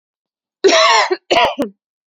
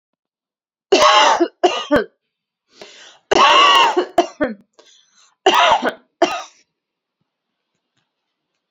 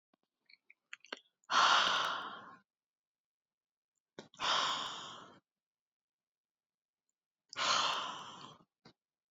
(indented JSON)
{
  "cough_length": "2.1 s",
  "cough_amplitude": 32767,
  "cough_signal_mean_std_ratio": 0.53,
  "three_cough_length": "8.7 s",
  "three_cough_amplitude": 31952,
  "three_cough_signal_mean_std_ratio": 0.42,
  "exhalation_length": "9.3 s",
  "exhalation_amplitude": 4996,
  "exhalation_signal_mean_std_ratio": 0.37,
  "survey_phase": "beta (2021-08-13 to 2022-03-07)",
  "age": "18-44",
  "gender": "Female",
  "wearing_mask": "No",
  "symptom_runny_or_blocked_nose": true,
  "symptom_sore_throat": true,
  "symptom_fatigue": true,
  "symptom_headache": true,
  "symptom_onset": "4 days",
  "smoker_status": "Never smoked",
  "respiratory_condition_asthma": false,
  "respiratory_condition_other": false,
  "recruitment_source": "REACT",
  "submission_delay": "1 day",
  "covid_test_result": "Negative",
  "covid_test_method": "RT-qPCR"
}